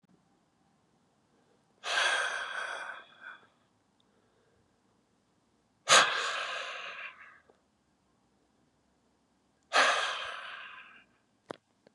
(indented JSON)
{
  "exhalation_length": "11.9 s",
  "exhalation_amplitude": 13742,
  "exhalation_signal_mean_std_ratio": 0.33,
  "survey_phase": "beta (2021-08-13 to 2022-03-07)",
  "age": "45-64",
  "gender": "Male",
  "wearing_mask": "No",
  "symptom_cough_any": true,
  "symptom_runny_or_blocked_nose": true,
  "symptom_shortness_of_breath": true,
  "symptom_sore_throat": true,
  "symptom_fatigue": true,
  "symptom_fever_high_temperature": true,
  "symptom_headache": true,
  "symptom_change_to_sense_of_smell_or_taste": true,
  "symptom_loss_of_taste": true,
  "symptom_other": true,
  "symptom_onset": "4 days",
  "smoker_status": "Never smoked",
  "respiratory_condition_asthma": false,
  "respiratory_condition_other": false,
  "recruitment_source": "Test and Trace",
  "submission_delay": "3 days",
  "covid_test_result": "Positive",
  "covid_test_method": "RT-qPCR",
  "covid_ct_value": 16.5,
  "covid_ct_gene": "ORF1ab gene",
  "covid_ct_mean": 16.9,
  "covid_viral_load": "2900000 copies/ml",
  "covid_viral_load_category": "High viral load (>1M copies/ml)"
}